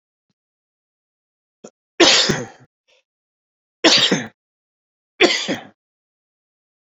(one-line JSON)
{"three_cough_length": "6.8 s", "three_cough_amplitude": 32487, "three_cough_signal_mean_std_ratio": 0.31, "survey_phase": "beta (2021-08-13 to 2022-03-07)", "age": "45-64", "gender": "Male", "wearing_mask": "No", "symptom_new_continuous_cough": true, "symptom_fatigue": true, "symptom_fever_high_temperature": true, "symptom_onset": "3 days", "smoker_status": "Never smoked", "respiratory_condition_asthma": false, "respiratory_condition_other": false, "recruitment_source": "Test and Trace", "submission_delay": "1 day", "covid_test_result": "Positive", "covid_test_method": "ePCR"}